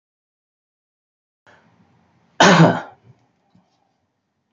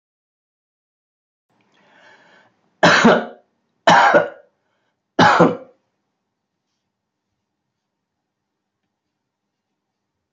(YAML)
cough_length: 4.5 s
cough_amplitude: 28427
cough_signal_mean_std_ratio: 0.24
three_cough_length: 10.3 s
three_cough_amplitude: 32768
three_cough_signal_mean_std_ratio: 0.27
survey_phase: beta (2021-08-13 to 2022-03-07)
age: 65+
gender: Male
wearing_mask: 'No'
symptom_none: true
smoker_status: Ex-smoker
respiratory_condition_asthma: false
respiratory_condition_other: false
recruitment_source: REACT
submission_delay: 2 days
covid_test_result: Negative
covid_test_method: RT-qPCR
influenza_a_test_result: Negative
influenza_b_test_result: Negative